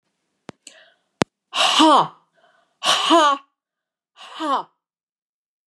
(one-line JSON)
{"exhalation_length": "5.7 s", "exhalation_amplitude": 30248, "exhalation_signal_mean_std_ratio": 0.38, "survey_phase": "beta (2021-08-13 to 2022-03-07)", "age": "65+", "gender": "Female", "wearing_mask": "No", "symptom_none": true, "smoker_status": "Never smoked", "respiratory_condition_asthma": false, "respiratory_condition_other": true, "recruitment_source": "REACT", "submission_delay": "5 days", "covid_test_result": "Negative", "covid_test_method": "RT-qPCR", "influenza_a_test_result": "Negative", "influenza_b_test_result": "Negative"}